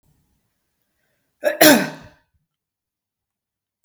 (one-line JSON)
{"cough_length": "3.8 s", "cough_amplitude": 32768, "cough_signal_mean_std_ratio": 0.23, "survey_phase": "beta (2021-08-13 to 2022-03-07)", "age": "45-64", "gender": "Female", "wearing_mask": "No", "symptom_none": true, "smoker_status": "Never smoked", "respiratory_condition_asthma": false, "respiratory_condition_other": false, "recruitment_source": "REACT", "submission_delay": "1 day", "covid_test_result": "Negative", "covid_test_method": "RT-qPCR", "influenza_a_test_result": "Negative", "influenza_b_test_result": "Negative"}